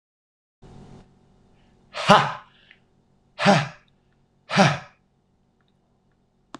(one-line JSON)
{"exhalation_length": "6.6 s", "exhalation_amplitude": 26028, "exhalation_signal_mean_std_ratio": 0.27, "survey_phase": "alpha (2021-03-01 to 2021-08-12)", "age": "45-64", "gender": "Male", "wearing_mask": "No", "symptom_none": true, "smoker_status": "Ex-smoker", "respiratory_condition_asthma": false, "respiratory_condition_other": false, "recruitment_source": "REACT", "submission_delay": "1 day", "covid_test_result": "Negative", "covid_test_method": "RT-qPCR"}